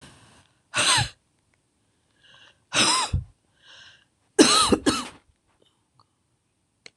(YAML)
exhalation_length: 7.0 s
exhalation_amplitude: 26027
exhalation_signal_mean_std_ratio: 0.34
survey_phase: beta (2021-08-13 to 2022-03-07)
age: 45-64
gender: Female
wearing_mask: 'No'
symptom_cough_any: true
symptom_runny_or_blocked_nose: true
symptom_shortness_of_breath: true
symptom_fatigue: true
symptom_headache: true
symptom_change_to_sense_of_smell_or_taste: true
symptom_onset: 2 days
smoker_status: Ex-smoker
respiratory_condition_asthma: true
respiratory_condition_other: false
recruitment_source: Test and Trace
submission_delay: 1 day
covid_test_result: Positive
covid_test_method: RT-qPCR
covid_ct_value: 18.9
covid_ct_gene: N gene